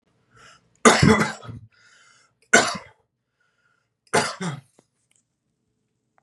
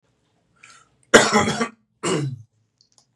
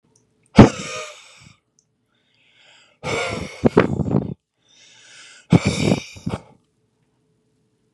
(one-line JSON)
{"three_cough_length": "6.2 s", "three_cough_amplitude": 31839, "three_cough_signal_mean_std_ratio": 0.28, "cough_length": "3.2 s", "cough_amplitude": 32768, "cough_signal_mean_std_ratio": 0.35, "exhalation_length": "7.9 s", "exhalation_amplitude": 32768, "exhalation_signal_mean_std_ratio": 0.29, "survey_phase": "beta (2021-08-13 to 2022-03-07)", "age": "18-44", "gender": "Male", "wearing_mask": "No", "symptom_new_continuous_cough": true, "symptom_sore_throat": true, "symptom_headache": true, "smoker_status": "Never smoked", "respiratory_condition_asthma": false, "respiratory_condition_other": false, "recruitment_source": "Test and Trace", "submission_delay": "2 days", "covid_test_result": "Positive", "covid_test_method": "LFT"}